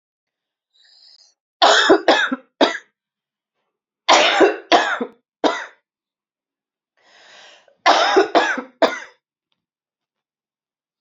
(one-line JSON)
{"three_cough_length": "11.0 s", "three_cough_amplitude": 32768, "three_cough_signal_mean_std_ratio": 0.37, "survey_phase": "alpha (2021-03-01 to 2021-08-12)", "age": "18-44", "gender": "Female", "wearing_mask": "No", "symptom_cough_any": true, "symptom_shortness_of_breath": true, "symptom_fatigue": true, "symptom_fever_high_temperature": true, "symptom_change_to_sense_of_smell_or_taste": true, "symptom_onset": "4 days", "smoker_status": "Ex-smoker", "respiratory_condition_asthma": true, "respiratory_condition_other": false, "recruitment_source": "Test and Trace", "submission_delay": "2 days", "covid_test_result": "Positive", "covid_test_method": "RT-qPCR", "covid_ct_value": 35.6, "covid_ct_gene": "N gene", "covid_ct_mean": 35.6, "covid_viral_load": "2.1 copies/ml", "covid_viral_load_category": "Minimal viral load (< 10K copies/ml)"}